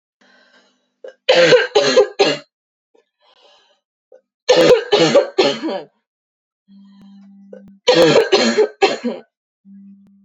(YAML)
three_cough_length: 10.2 s
three_cough_amplitude: 29374
three_cough_signal_mean_std_ratio: 0.45
survey_phase: beta (2021-08-13 to 2022-03-07)
age: 18-44
gender: Female
wearing_mask: 'No'
symptom_cough_any: true
symptom_runny_or_blocked_nose: true
symptom_fatigue: true
symptom_onset: 2 days
smoker_status: Never smoked
respiratory_condition_asthma: false
respiratory_condition_other: false
recruitment_source: Test and Trace
submission_delay: 1 day
covid_test_result: Positive
covid_test_method: ePCR